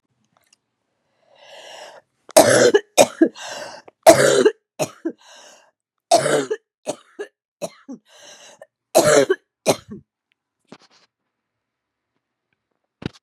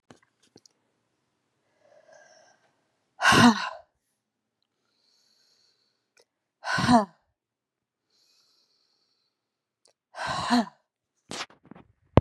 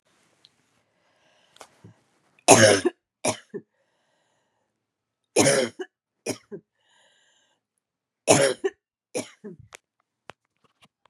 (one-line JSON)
{"cough_length": "13.2 s", "cough_amplitude": 32768, "cough_signal_mean_std_ratio": 0.31, "exhalation_length": "12.2 s", "exhalation_amplitude": 32767, "exhalation_signal_mean_std_ratio": 0.23, "three_cough_length": "11.1 s", "three_cough_amplitude": 32768, "three_cough_signal_mean_std_ratio": 0.25, "survey_phase": "beta (2021-08-13 to 2022-03-07)", "age": "45-64", "gender": "Female", "wearing_mask": "No", "symptom_cough_any": true, "symptom_runny_or_blocked_nose": true, "symptom_fatigue": true, "symptom_headache": true, "symptom_onset": "3 days", "smoker_status": "Ex-smoker", "respiratory_condition_asthma": false, "respiratory_condition_other": false, "recruitment_source": "Test and Trace", "submission_delay": "1 day", "covid_test_result": "Positive", "covid_test_method": "RT-qPCR", "covid_ct_value": 16.0, "covid_ct_gene": "ORF1ab gene", "covid_ct_mean": 16.2, "covid_viral_load": "4700000 copies/ml", "covid_viral_load_category": "High viral load (>1M copies/ml)"}